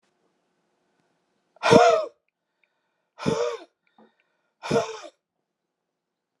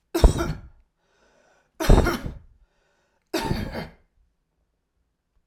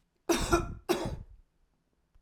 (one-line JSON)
{"exhalation_length": "6.4 s", "exhalation_amplitude": 28466, "exhalation_signal_mean_std_ratio": 0.28, "three_cough_length": "5.5 s", "three_cough_amplitude": 27370, "three_cough_signal_mean_std_ratio": 0.3, "cough_length": "2.2 s", "cough_amplitude": 8684, "cough_signal_mean_std_ratio": 0.44, "survey_phase": "alpha (2021-03-01 to 2021-08-12)", "age": "65+", "gender": "Male", "wearing_mask": "No", "symptom_none": true, "smoker_status": "Ex-smoker", "respiratory_condition_asthma": false, "respiratory_condition_other": false, "recruitment_source": "REACT", "submission_delay": "1 day", "covid_test_result": "Negative", "covid_test_method": "RT-qPCR"}